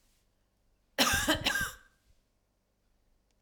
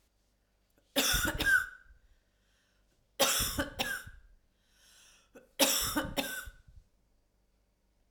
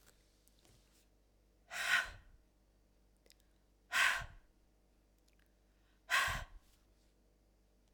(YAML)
cough_length: 3.4 s
cough_amplitude: 10049
cough_signal_mean_std_ratio: 0.36
three_cough_length: 8.1 s
three_cough_amplitude: 9131
three_cough_signal_mean_std_ratio: 0.41
exhalation_length: 7.9 s
exhalation_amplitude: 3989
exhalation_signal_mean_std_ratio: 0.3
survey_phase: alpha (2021-03-01 to 2021-08-12)
age: 65+
gender: Female
wearing_mask: 'No'
symptom_none: true
smoker_status: Never smoked
respiratory_condition_asthma: false
respiratory_condition_other: false
recruitment_source: REACT
submission_delay: 1 day
covid_test_result: Negative
covid_test_method: RT-qPCR